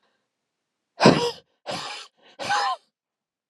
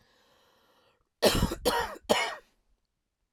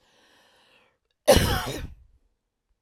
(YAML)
exhalation_length: 3.5 s
exhalation_amplitude: 30569
exhalation_signal_mean_std_ratio: 0.33
three_cough_length: 3.3 s
three_cough_amplitude: 12380
three_cough_signal_mean_std_ratio: 0.38
cough_length: 2.8 s
cough_amplitude: 20519
cough_signal_mean_std_ratio: 0.3
survey_phase: alpha (2021-03-01 to 2021-08-12)
age: 45-64
gender: Female
wearing_mask: 'No'
symptom_fatigue: true
symptom_onset: 12 days
smoker_status: Never smoked
respiratory_condition_asthma: false
respiratory_condition_other: false
recruitment_source: REACT
submission_delay: 1 day
covid_test_result: Negative
covid_test_method: RT-qPCR